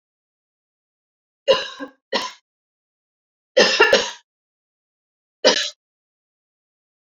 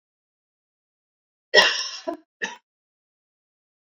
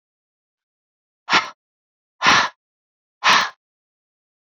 {"three_cough_length": "7.1 s", "three_cough_amplitude": 31683, "three_cough_signal_mean_std_ratio": 0.28, "cough_length": "3.9 s", "cough_amplitude": 27583, "cough_signal_mean_std_ratio": 0.23, "exhalation_length": "4.4 s", "exhalation_amplitude": 28585, "exhalation_signal_mean_std_ratio": 0.3, "survey_phase": "beta (2021-08-13 to 2022-03-07)", "age": "45-64", "gender": "Female", "wearing_mask": "No", "symptom_none": true, "smoker_status": "Never smoked", "respiratory_condition_asthma": false, "respiratory_condition_other": false, "recruitment_source": "REACT", "submission_delay": "4 days", "covid_test_result": "Negative", "covid_test_method": "RT-qPCR"}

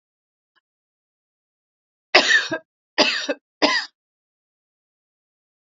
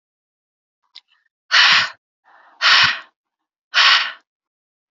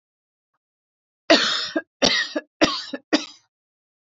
{"three_cough_length": "5.6 s", "three_cough_amplitude": 31878, "three_cough_signal_mean_std_ratio": 0.29, "exhalation_length": "4.9 s", "exhalation_amplitude": 32767, "exhalation_signal_mean_std_ratio": 0.37, "cough_length": "4.1 s", "cough_amplitude": 26978, "cough_signal_mean_std_ratio": 0.37, "survey_phase": "beta (2021-08-13 to 2022-03-07)", "age": "45-64", "gender": "Female", "wearing_mask": "No", "symptom_none": true, "smoker_status": "Never smoked", "respiratory_condition_asthma": false, "respiratory_condition_other": false, "recruitment_source": "REACT", "submission_delay": "0 days", "covid_test_result": "Negative", "covid_test_method": "RT-qPCR"}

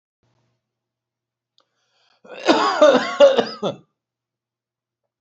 {"cough_length": "5.2 s", "cough_amplitude": 29539, "cough_signal_mean_std_ratio": 0.33, "survey_phase": "beta (2021-08-13 to 2022-03-07)", "age": "65+", "gender": "Male", "wearing_mask": "No", "symptom_none": true, "smoker_status": "Never smoked", "respiratory_condition_asthma": false, "respiratory_condition_other": false, "recruitment_source": "REACT", "submission_delay": "1 day", "covid_test_result": "Negative", "covid_test_method": "RT-qPCR", "influenza_a_test_result": "Negative", "influenza_b_test_result": "Negative"}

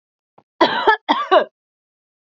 {"cough_length": "2.4 s", "cough_amplitude": 27442, "cough_signal_mean_std_ratio": 0.38, "survey_phase": "beta (2021-08-13 to 2022-03-07)", "age": "18-44", "gender": "Female", "wearing_mask": "No", "symptom_cough_any": true, "symptom_headache": true, "symptom_change_to_sense_of_smell_or_taste": true, "smoker_status": "Never smoked", "respiratory_condition_asthma": false, "respiratory_condition_other": false, "recruitment_source": "Test and Trace", "submission_delay": "2 days", "covid_test_result": "Positive", "covid_test_method": "RT-qPCR"}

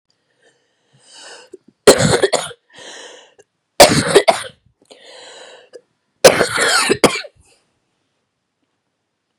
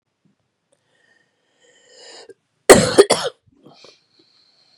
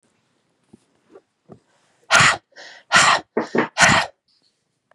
{"three_cough_length": "9.4 s", "three_cough_amplitude": 32768, "three_cough_signal_mean_std_ratio": 0.32, "cough_length": "4.8 s", "cough_amplitude": 32768, "cough_signal_mean_std_ratio": 0.22, "exhalation_length": "4.9 s", "exhalation_amplitude": 32765, "exhalation_signal_mean_std_ratio": 0.36, "survey_phase": "beta (2021-08-13 to 2022-03-07)", "age": "45-64", "gender": "Female", "wearing_mask": "No", "symptom_cough_any": true, "symptom_shortness_of_breath": true, "symptom_onset": "8 days", "smoker_status": "Ex-smoker", "respiratory_condition_asthma": false, "respiratory_condition_other": false, "recruitment_source": "REACT", "submission_delay": "2 days", "covid_test_result": "Negative", "covid_test_method": "RT-qPCR", "influenza_a_test_result": "Negative", "influenza_b_test_result": "Negative"}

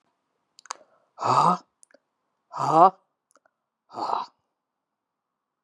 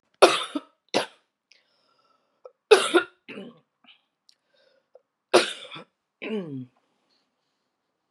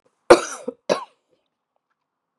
{"exhalation_length": "5.6 s", "exhalation_amplitude": 26042, "exhalation_signal_mean_std_ratio": 0.28, "three_cough_length": "8.1 s", "three_cough_amplitude": 32737, "three_cough_signal_mean_std_ratio": 0.24, "cough_length": "2.4 s", "cough_amplitude": 32768, "cough_signal_mean_std_ratio": 0.21, "survey_phase": "beta (2021-08-13 to 2022-03-07)", "age": "45-64", "gender": "Female", "wearing_mask": "No", "symptom_cough_any": true, "symptom_runny_or_blocked_nose": true, "symptom_sore_throat": true, "symptom_headache": true, "symptom_onset": "2 days", "smoker_status": "Ex-smoker", "respiratory_condition_asthma": false, "respiratory_condition_other": false, "recruitment_source": "Test and Trace", "submission_delay": "1 day", "covid_test_result": "Positive", "covid_test_method": "RT-qPCR", "covid_ct_value": 36.4, "covid_ct_gene": "ORF1ab gene"}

